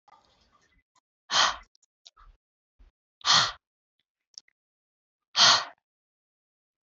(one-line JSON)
{"exhalation_length": "6.8 s", "exhalation_amplitude": 15846, "exhalation_signal_mean_std_ratio": 0.25, "survey_phase": "beta (2021-08-13 to 2022-03-07)", "age": "18-44", "gender": "Female", "wearing_mask": "No", "symptom_cough_any": true, "symptom_new_continuous_cough": true, "symptom_runny_or_blocked_nose": true, "symptom_onset": "4 days", "smoker_status": "Never smoked", "respiratory_condition_asthma": false, "respiratory_condition_other": false, "recruitment_source": "Test and Trace", "submission_delay": "2 days", "covid_test_result": "Positive", "covid_test_method": "RT-qPCR", "covid_ct_value": 19.9, "covid_ct_gene": "ORF1ab gene", "covid_ct_mean": 20.2, "covid_viral_load": "240000 copies/ml", "covid_viral_load_category": "Low viral load (10K-1M copies/ml)"}